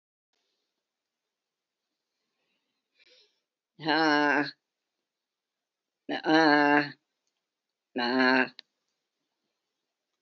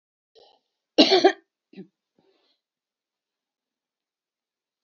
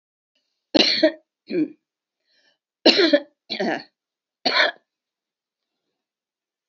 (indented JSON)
{
  "exhalation_length": "10.2 s",
  "exhalation_amplitude": 12555,
  "exhalation_signal_mean_std_ratio": 0.31,
  "cough_length": "4.8 s",
  "cough_amplitude": 26237,
  "cough_signal_mean_std_ratio": 0.19,
  "three_cough_length": "6.7 s",
  "three_cough_amplitude": 28886,
  "three_cough_signal_mean_std_ratio": 0.33,
  "survey_phase": "alpha (2021-03-01 to 2021-08-12)",
  "age": "65+",
  "gender": "Female",
  "wearing_mask": "No",
  "symptom_none": true,
  "smoker_status": "Ex-smoker",
  "respiratory_condition_asthma": false,
  "respiratory_condition_other": false,
  "recruitment_source": "REACT",
  "submission_delay": "1 day",
  "covid_test_result": "Negative",
  "covid_test_method": "RT-qPCR"
}